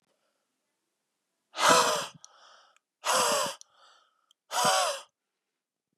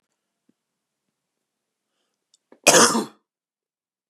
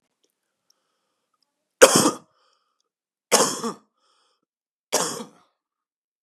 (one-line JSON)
{"exhalation_length": "6.0 s", "exhalation_amplitude": 15280, "exhalation_signal_mean_std_ratio": 0.39, "cough_length": "4.1 s", "cough_amplitude": 32767, "cough_signal_mean_std_ratio": 0.22, "three_cough_length": "6.2 s", "three_cough_amplitude": 32768, "three_cough_signal_mean_std_ratio": 0.24, "survey_phase": "beta (2021-08-13 to 2022-03-07)", "age": "18-44", "gender": "Male", "wearing_mask": "No", "symptom_none": true, "smoker_status": "Never smoked", "respiratory_condition_asthma": false, "respiratory_condition_other": false, "recruitment_source": "REACT", "submission_delay": "1 day", "covid_test_result": "Negative", "covid_test_method": "RT-qPCR"}